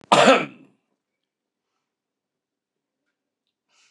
{"cough_length": "3.9 s", "cough_amplitude": 29069, "cough_signal_mean_std_ratio": 0.22, "survey_phase": "beta (2021-08-13 to 2022-03-07)", "age": "65+", "gender": "Male", "wearing_mask": "No", "symptom_cough_any": true, "symptom_runny_or_blocked_nose": true, "symptom_onset": "12 days", "smoker_status": "Never smoked", "respiratory_condition_asthma": false, "respiratory_condition_other": false, "recruitment_source": "REACT", "submission_delay": "1 day", "covid_test_result": "Negative", "covid_test_method": "RT-qPCR", "influenza_a_test_result": "Negative", "influenza_b_test_result": "Negative"}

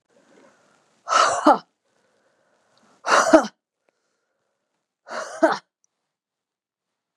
{"exhalation_length": "7.2 s", "exhalation_amplitude": 32767, "exhalation_signal_mean_std_ratio": 0.28, "survey_phase": "beta (2021-08-13 to 2022-03-07)", "age": "45-64", "gender": "Female", "wearing_mask": "No", "symptom_cough_any": true, "symptom_runny_or_blocked_nose": true, "symptom_sore_throat": true, "symptom_abdominal_pain": true, "symptom_fatigue": true, "symptom_headache": true, "smoker_status": "Never smoked", "respiratory_condition_asthma": false, "respiratory_condition_other": false, "recruitment_source": "Test and Trace", "submission_delay": "1 day", "covid_test_result": "Positive", "covid_test_method": "ePCR"}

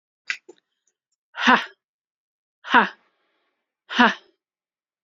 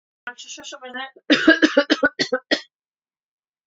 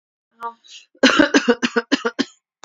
{"exhalation_length": "5.0 s", "exhalation_amplitude": 28240, "exhalation_signal_mean_std_ratio": 0.24, "cough_length": "3.7 s", "cough_amplitude": 29157, "cough_signal_mean_std_ratio": 0.37, "three_cough_length": "2.6 s", "three_cough_amplitude": 31193, "three_cough_signal_mean_std_ratio": 0.41, "survey_phase": "beta (2021-08-13 to 2022-03-07)", "age": "18-44", "gender": "Female", "wearing_mask": "No", "symptom_cough_any": true, "symptom_runny_or_blocked_nose": true, "symptom_shortness_of_breath": true, "symptom_headache": true, "symptom_change_to_sense_of_smell_or_taste": true, "smoker_status": "Ex-smoker", "respiratory_condition_asthma": false, "respiratory_condition_other": false, "recruitment_source": "Test and Trace", "submission_delay": "1 day", "covid_test_result": "Positive", "covid_test_method": "LFT"}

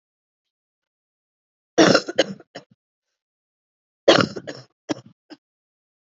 {"cough_length": "6.1 s", "cough_amplitude": 28852, "cough_signal_mean_std_ratio": 0.23, "survey_phase": "alpha (2021-03-01 to 2021-08-12)", "age": "18-44", "gender": "Female", "wearing_mask": "No", "symptom_cough_any": true, "symptom_shortness_of_breath": true, "symptom_fatigue": true, "symptom_headache": true, "symptom_loss_of_taste": true, "smoker_status": "Never smoked", "respiratory_condition_asthma": false, "respiratory_condition_other": false, "recruitment_source": "Test and Trace", "submission_delay": "2 days", "covid_test_result": "Positive", "covid_test_method": "ePCR"}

